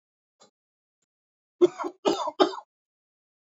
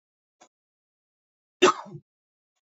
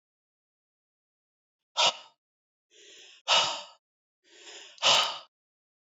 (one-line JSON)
{"three_cough_length": "3.5 s", "three_cough_amplitude": 19563, "three_cough_signal_mean_std_ratio": 0.26, "cough_length": "2.6 s", "cough_amplitude": 17734, "cough_signal_mean_std_ratio": 0.17, "exhalation_length": "6.0 s", "exhalation_amplitude": 11245, "exhalation_signal_mean_std_ratio": 0.29, "survey_phase": "beta (2021-08-13 to 2022-03-07)", "age": "18-44", "gender": "Male", "wearing_mask": "No", "symptom_none": true, "smoker_status": "Never smoked", "respiratory_condition_asthma": false, "respiratory_condition_other": false, "recruitment_source": "REACT", "submission_delay": "1 day", "covid_test_result": "Negative", "covid_test_method": "RT-qPCR"}